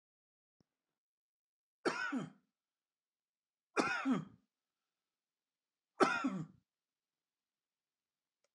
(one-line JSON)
{"three_cough_length": "8.5 s", "three_cough_amplitude": 5314, "three_cough_signal_mean_std_ratio": 0.28, "survey_phase": "alpha (2021-03-01 to 2021-08-12)", "age": "45-64", "gender": "Male", "wearing_mask": "No", "symptom_none": true, "smoker_status": "Ex-smoker", "respiratory_condition_asthma": false, "respiratory_condition_other": false, "recruitment_source": "REACT", "submission_delay": "1 day", "covid_test_result": "Negative", "covid_test_method": "RT-qPCR"}